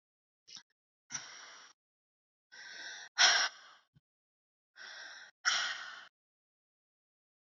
{"exhalation_length": "7.4 s", "exhalation_amplitude": 7718, "exhalation_signal_mean_std_ratio": 0.28, "survey_phase": "beta (2021-08-13 to 2022-03-07)", "age": "45-64", "gender": "Female", "wearing_mask": "No", "symptom_cough_any": true, "symptom_fatigue": true, "symptom_change_to_sense_of_smell_or_taste": true, "symptom_loss_of_taste": true, "symptom_onset": "8 days", "smoker_status": "Never smoked", "respiratory_condition_asthma": false, "respiratory_condition_other": false, "recruitment_source": "Test and Trace", "submission_delay": "2 days", "covid_test_result": "Positive", "covid_test_method": "RT-qPCR", "covid_ct_value": 15.0, "covid_ct_gene": "ORF1ab gene", "covid_ct_mean": 15.3, "covid_viral_load": "9900000 copies/ml", "covid_viral_load_category": "High viral load (>1M copies/ml)"}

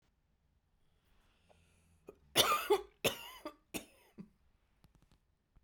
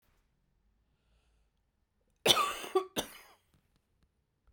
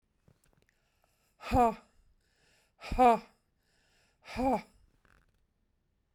{"three_cough_length": "5.6 s", "three_cough_amplitude": 8495, "three_cough_signal_mean_std_ratio": 0.27, "cough_length": "4.5 s", "cough_amplitude": 14698, "cough_signal_mean_std_ratio": 0.25, "exhalation_length": "6.1 s", "exhalation_amplitude": 8825, "exhalation_signal_mean_std_ratio": 0.28, "survey_phase": "beta (2021-08-13 to 2022-03-07)", "age": "45-64", "gender": "Female", "wearing_mask": "No", "symptom_none": true, "smoker_status": "Never smoked", "respiratory_condition_asthma": false, "respiratory_condition_other": false, "recruitment_source": "REACT", "submission_delay": "3 days", "covid_test_result": "Negative", "covid_test_method": "RT-qPCR", "influenza_a_test_result": "Negative", "influenza_b_test_result": "Negative"}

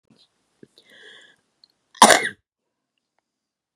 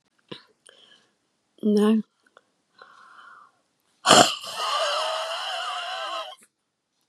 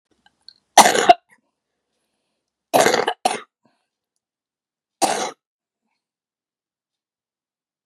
{"cough_length": "3.8 s", "cough_amplitude": 32768, "cough_signal_mean_std_ratio": 0.18, "exhalation_length": "7.1 s", "exhalation_amplitude": 32674, "exhalation_signal_mean_std_ratio": 0.4, "three_cough_length": "7.9 s", "three_cough_amplitude": 32768, "three_cough_signal_mean_std_ratio": 0.24, "survey_phase": "beta (2021-08-13 to 2022-03-07)", "age": "65+", "gender": "Female", "wearing_mask": "No", "symptom_cough_any": true, "symptom_fatigue": true, "symptom_headache": true, "symptom_change_to_sense_of_smell_or_taste": true, "smoker_status": "Never smoked", "respiratory_condition_asthma": true, "respiratory_condition_other": false, "recruitment_source": "Test and Trace", "submission_delay": "2 days", "covid_test_result": "Positive", "covid_test_method": "LFT"}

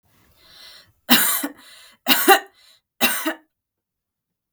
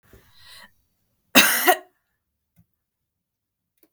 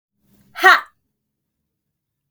{"three_cough_length": "4.5 s", "three_cough_amplitude": 32768, "three_cough_signal_mean_std_ratio": 0.34, "cough_length": "3.9 s", "cough_amplitude": 32768, "cough_signal_mean_std_ratio": 0.24, "exhalation_length": "2.3 s", "exhalation_amplitude": 32768, "exhalation_signal_mean_std_ratio": 0.22, "survey_phase": "beta (2021-08-13 to 2022-03-07)", "age": "18-44", "gender": "Female", "wearing_mask": "No", "symptom_none": true, "smoker_status": "Never smoked", "respiratory_condition_asthma": true, "respiratory_condition_other": false, "recruitment_source": "REACT", "submission_delay": "5 days", "covid_test_result": "Negative", "covid_test_method": "RT-qPCR"}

